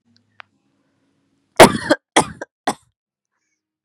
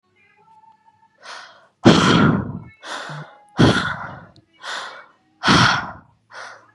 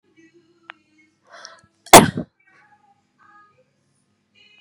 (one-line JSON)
{"three_cough_length": "3.8 s", "three_cough_amplitude": 32768, "three_cough_signal_mean_std_ratio": 0.21, "exhalation_length": "6.7 s", "exhalation_amplitude": 32768, "exhalation_signal_mean_std_ratio": 0.41, "cough_length": "4.6 s", "cough_amplitude": 32768, "cough_signal_mean_std_ratio": 0.15, "survey_phase": "beta (2021-08-13 to 2022-03-07)", "age": "18-44", "gender": "Female", "wearing_mask": "No", "symptom_cough_any": true, "symptom_new_continuous_cough": true, "symptom_runny_or_blocked_nose": true, "symptom_shortness_of_breath": true, "symptom_headache": true, "symptom_onset": "2 days", "smoker_status": "Current smoker (1 to 10 cigarettes per day)", "respiratory_condition_asthma": false, "respiratory_condition_other": false, "recruitment_source": "REACT", "submission_delay": "1 day", "covid_test_result": "Negative", "covid_test_method": "RT-qPCR", "influenza_a_test_result": "Negative", "influenza_b_test_result": "Negative"}